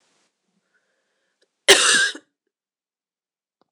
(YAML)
cough_length: 3.7 s
cough_amplitude: 26028
cough_signal_mean_std_ratio: 0.25
survey_phase: beta (2021-08-13 to 2022-03-07)
age: 45-64
gender: Female
wearing_mask: 'No'
symptom_runny_or_blocked_nose: true
symptom_shortness_of_breath: true
symptom_abdominal_pain: true
symptom_diarrhoea: true
symptom_fatigue: true
symptom_loss_of_taste: true
symptom_other: true
symptom_onset: 4 days
smoker_status: Never smoked
respiratory_condition_asthma: false
respiratory_condition_other: false
recruitment_source: Test and Trace
submission_delay: 2 days
covid_test_result: Positive
covid_test_method: RT-qPCR
covid_ct_value: 10.0
covid_ct_gene: ORF1ab gene